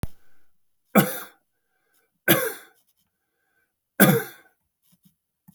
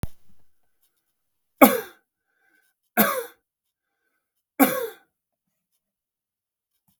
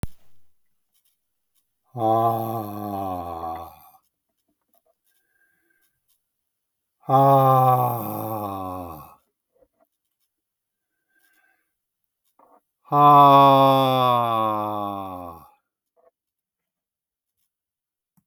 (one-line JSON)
{"cough_length": "5.5 s", "cough_amplitude": 30338, "cough_signal_mean_std_ratio": 0.28, "three_cough_length": "7.0 s", "three_cough_amplitude": 32766, "three_cough_signal_mean_std_ratio": 0.22, "exhalation_length": "18.3 s", "exhalation_amplitude": 22915, "exhalation_signal_mean_std_ratio": 0.38, "survey_phase": "beta (2021-08-13 to 2022-03-07)", "age": "65+", "gender": "Male", "wearing_mask": "No", "symptom_none": true, "smoker_status": "Ex-smoker", "respiratory_condition_asthma": false, "respiratory_condition_other": false, "recruitment_source": "REACT", "submission_delay": "4 days", "covid_test_result": "Negative", "covid_test_method": "RT-qPCR", "covid_ct_value": 46.0, "covid_ct_gene": "N gene"}